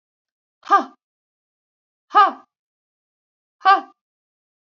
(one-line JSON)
{"exhalation_length": "4.7 s", "exhalation_amplitude": 26253, "exhalation_signal_mean_std_ratio": 0.23, "survey_phase": "beta (2021-08-13 to 2022-03-07)", "age": "45-64", "gender": "Female", "wearing_mask": "No", "symptom_runny_or_blocked_nose": true, "symptom_sore_throat": true, "symptom_headache": true, "smoker_status": "Never smoked", "respiratory_condition_asthma": false, "respiratory_condition_other": false, "recruitment_source": "REACT", "submission_delay": "2 days", "covid_test_result": "Negative", "covid_test_method": "RT-qPCR", "influenza_a_test_result": "Negative", "influenza_b_test_result": "Negative"}